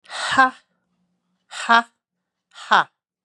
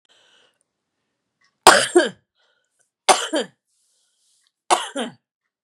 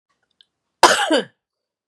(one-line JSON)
{"exhalation_length": "3.2 s", "exhalation_amplitude": 29354, "exhalation_signal_mean_std_ratio": 0.31, "three_cough_length": "5.6 s", "three_cough_amplitude": 32768, "three_cough_signal_mean_std_ratio": 0.26, "cough_length": "1.9 s", "cough_amplitude": 32768, "cough_signal_mean_std_ratio": 0.32, "survey_phase": "beta (2021-08-13 to 2022-03-07)", "age": "45-64", "gender": "Female", "wearing_mask": "No", "symptom_none": true, "smoker_status": "Never smoked", "respiratory_condition_asthma": false, "respiratory_condition_other": false, "recruitment_source": "Test and Trace", "submission_delay": "2 days", "covid_test_result": "Positive", "covid_test_method": "RT-qPCR", "covid_ct_value": 19.1, "covid_ct_gene": "ORF1ab gene", "covid_ct_mean": 19.2, "covid_viral_load": "510000 copies/ml", "covid_viral_load_category": "Low viral load (10K-1M copies/ml)"}